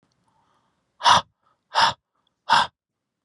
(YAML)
exhalation_length: 3.2 s
exhalation_amplitude: 26547
exhalation_signal_mean_std_ratio: 0.31
survey_phase: beta (2021-08-13 to 2022-03-07)
age: 18-44
gender: Male
wearing_mask: 'No'
symptom_cough_any: true
symptom_runny_or_blocked_nose: true
symptom_onset: 13 days
smoker_status: Never smoked
respiratory_condition_asthma: false
respiratory_condition_other: false
recruitment_source: REACT
submission_delay: 0 days
covid_test_result: Negative
covid_test_method: RT-qPCR